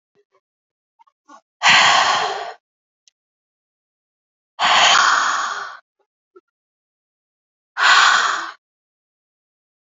{"exhalation_length": "9.9 s", "exhalation_amplitude": 32659, "exhalation_signal_mean_std_ratio": 0.4, "survey_phase": "beta (2021-08-13 to 2022-03-07)", "age": "18-44", "gender": "Female", "wearing_mask": "No", "symptom_none": true, "symptom_onset": "12 days", "smoker_status": "Never smoked", "respiratory_condition_asthma": true, "respiratory_condition_other": false, "recruitment_source": "REACT", "submission_delay": "1 day", "covid_test_result": "Negative", "covid_test_method": "RT-qPCR", "influenza_a_test_result": "Unknown/Void", "influenza_b_test_result": "Unknown/Void"}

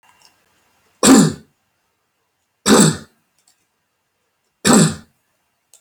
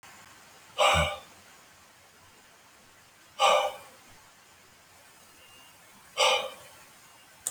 {"three_cough_length": "5.8 s", "three_cough_amplitude": 32768, "three_cough_signal_mean_std_ratio": 0.32, "exhalation_length": "7.5 s", "exhalation_amplitude": 12271, "exhalation_signal_mean_std_ratio": 0.34, "survey_phase": "alpha (2021-03-01 to 2021-08-12)", "age": "65+", "gender": "Male", "wearing_mask": "No", "symptom_none": true, "smoker_status": "Ex-smoker", "respiratory_condition_asthma": false, "respiratory_condition_other": false, "recruitment_source": "REACT", "submission_delay": "1 day", "covid_test_result": "Negative", "covid_test_method": "RT-qPCR"}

